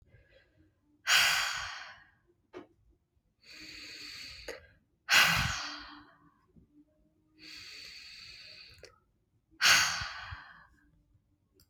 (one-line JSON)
{"exhalation_length": "11.7 s", "exhalation_amplitude": 9448, "exhalation_signal_mean_std_ratio": 0.34, "survey_phase": "beta (2021-08-13 to 2022-03-07)", "age": "18-44", "gender": "Female", "wearing_mask": "No", "symptom_cough_any": true, "symptom_runny_or_blocked_nose": true, "symptom_sore_throat": true, "smoker_status": "Never smoked", "respiratory_condition_asthma": false, "respiratory_condition_other": false, "recruitment_source": "Test and Trace", "submission_delay": "1 day", "covid_test_result": "Positive", "covid_test_method": "LFT"}